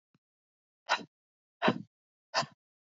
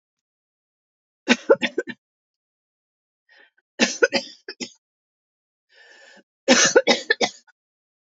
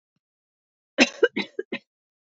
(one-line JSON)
{"exhalation_length": "3.0 s", "exhalation_amplitude": 7654, "exhalation_signal_mean_std_ratio": 0.25, "three_cough_length": "8.1 s", "three_cough_amplitude": 31685, "three_cough_signal_mean_std_ratio": 0.27, "cough_length": "2.4 s", "cough_amplitude": 26484, "cough_signal_mean_std_ratio": 0.23, "survey_phase": "beta (2021-08-13 to 2022-03-07)", "age": "45-64", "gender": "Female", "wearing_mask": "No", "symptom_none": true, "smoker_status": "Never smoked", "respiratory_condition_asthma": false, "respiratory_condition_other": false, "recruitment_source": "REACT", "submission_delay": "1 day", "covid_test_result": "Negative", "covid_test_method": "RT-qPCR", "influenza_a_test_result": "Negative", "influenza_b_test_result": "Negative"}